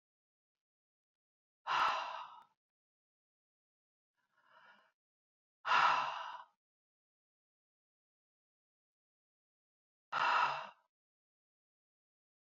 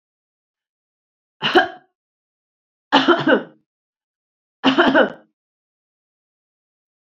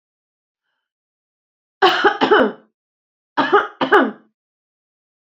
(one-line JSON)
{"exhalation_length": "12.5 s", "exhalation_amplitude": 4140, "exhalation_signal_mean_std_ratio": 0.28, "three_cough_length": "7.1 s", "three_cough_amplitude": 27298, "three_cough_signal_mean_std_ratio": 0.3, "cough_length": "5.3 s", "cough_amplitude": 32768, "cough_signal_mean_std_ratio": 0.36, "survey_phase": "beta (2021-08-13 to 2022-03-07)", "age": "65+", "gender": "Female", "wearing_mask": "No", "symptom_none": true, "smoker_status": "Ex-smoker", "respiratory_condition_asthma": false, "respiratory_condition_other": false, "recruitment_source": "REACT", "submission_delay": "2 days", "covid_test_result": "Negative", "covid_test_method": "RT-qPCR", "influenza_a_test_result": "Unknown/Void", "influenza_b_test_result": "Unknown/Void"}